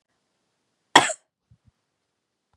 {"cough_length": "2.6 s", "cough_amplitude": 32768, "cough_signal_mean_std_ratio": 0.15, "survey_phase": "beta (2021-08-13 to 2022-03-07)", "age": "45-64", "gender": "Female", "wearing_mask": "No", "symptom_cough_any": true, "symptom_fatigue": true, "symptom_headache": true, "symptom_onset": "4 days", "smoker_status": "Never smoked", "respiratory_condition_asthma": false, "respiratory_condition_other": false, "recruitment_source": "Test and Trace", "submission_delay": "2 days", "covid_test_result": "Positive", "covid_test_method": "RT-qPCR", "covid_ct_value": 24.9, "covid_ct_gene": "ORF1ab gene"}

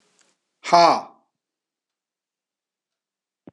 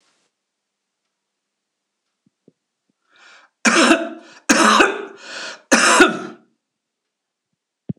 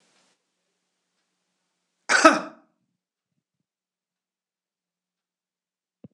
{"exhalation_length": "3.5 s", "exhalation_amplitude": 26015, "exhalation_signal_mean_std_ratio": 0.22, "three_cough_length": "8.0 s", "three_cough_amplitude": 26028, "three_cough_signal_mean_std_ratio": 0.34, "cough_length": "6.1 s", "cough_amplitude": 26028, "cough_signal_mean_std_ratio": 0.16, "survey_phase": "beta (2021-08-13 to 2022-03-07)", "age": "65+", "gender": "Male", "wearing_mask": "No", "symptom_none": true, "smoker_status": "Ex-smoker", "respiratory_condition_asthma": false, "respiratory_condition_other": false, "recruitment_source": "REACT", "submission_delay": "2 days", "covid_test_result": "Negative", "covid_test_method": "RT-qPCR", "influenza_a_test_result": "Negative", "influenza_b_test_result": "Negative"}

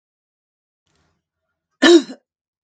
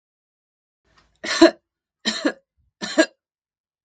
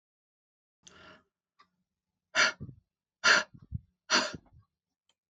{"cough_length": "2.6 s", "cough_amplitude": 32768, "cough_signal_mean_std_ratio": 0.23, "three_cough_length": "3.8 s", "three_cough_amplitude": 32767, "three_cough_signal_mean_std_ratio": 0.25, "exhalation_length": "5.3 s", "exhalation_amplitude": 10710, "exhalation_signal_mean_std_ratio": 0.26, "survey_phase": "beta (2021-08-13 to 2022-03-07)", "age": "45-64", "gender": "Female", "wearing_mask": "No", "symptom_sore_throat": true, "smoker_status": "Never smoked", "respiratory_condition_asthma": true, "respiratory_condition_other": false, "recruitment_source": "REACT", "submission_delay": "1 day", "covid_test_result": "Negative", "covid_test_method": "RT-qPCR", "influenza_a_test_result": "Negative", "influenza_b_test_result": "Negative"}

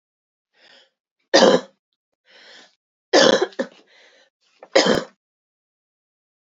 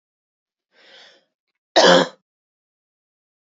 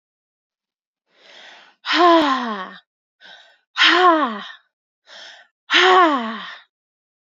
{"three_cough_length": "6.6 s", "three_cough_amplitude": 30547, "three_cough_signal_mean_std_ratio": 0.29, "cough_length": "3.5 s", "cough_amplitude": 29182, "cough_signal_mean_std_ratio": 0.24, "exhalation_length": "7.3 s", "exhalation_amplitude": 28567, "exhalation_signal_mean_std_ratio": 0.42, "survey_phase": "beta (2021-08-13 to 2022-03-07)", "age": "18-44", "gender": "Female", "wearing_mask": "No", "symptom_cough_any": true, "symptom_shortness_of_breath": true, "symptom_onset": "4 days", "smoker_status": "Never smoked", "respiratory_condition_asthma": false, "respiratory_condition_other": false, "recruitment_source": "Test and Trace", "submission_delay": "2 days", "covid_test_result": "Positive", "covid_test_method": "RT-qPCR", "covid_ct_value": 26.7, "covid_ct_gene": "ORF1ab gene"}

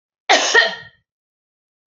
{"cough_length": "1.9 s", "cough_amplitude": 29412, "cough_signal_mean_std_ratio": 0.37, "survey_phase": "beta (2021-08-13 to 2022-03-07)", "age": "45-64", "gender": "Female", "wearing_mask": "No", "symptom_none": true, "symptom_onset": "12 days", "smoker_status": "Never smoked", "respiratory_condition_asthma": false, "respiratory_condition_other": false, "recruitment_source": "REACT", "submission_delay": "2 days", "covid_test_result": "Negative", "covid_test_method": "RT-qPCR", "influenza_a_test_result": "Negative", "influenza_b_test_result": "Negative"}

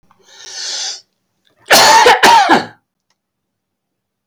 {"cough_length": "4.3 s", "cough_amplitude": 32768, "cough_signal_mean_std_ratio": 0.45, "survey_phase": "beta (2021-08-13 to 2022-03-07)", "age": "45-64", "gender": "Male", "wearing_mask": "No", "symptom_none": true, "smoker_status": "Never smoked", "respiratory_condition_asthma": false, "respiratory_condition_other": false, "recruitment_source": "REACT", "submission_delay": "3 days", "covid_test_result": "Negative", "covid_test_method": "RT-qPCR", "influenza_a_test_result": "Negative", "influenza_b_test_result": "Negative"}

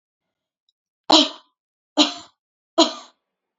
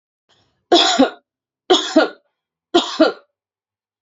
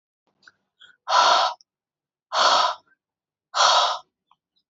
{"cough_length": "3.6 s", "cough_amplitude": 30314, "cough_signal_mean_std_ratio": 0.26, "three_cough_length": "4.0 s", "three_cough_amplitude": 30941, "three_cough_signal_mean_std_ratio": 0.38, "exhalation_length": "4.7 s", "exhalation_amplitude": 20132, "exhalation_signal_mean_std_ratio": 0.43, "survey_phase": "beta (2021-08-13 to 2022-03-07)", "age": "18-44", "gender": "Female", "wearing_mask": "No", "symptom_none": true, "smoker_status": "Ex-smoker", "respiratory_condition_asthma": false, "respiratory_condition_other": false, "recruitment_source": "REACT", "submission_delay": "1 day", "covid_test_result": "Negative", "covid_test_method": "RT-qPCR", "influenza_a_test_result": "Negative", "influenza_b_test_result": "Negative"}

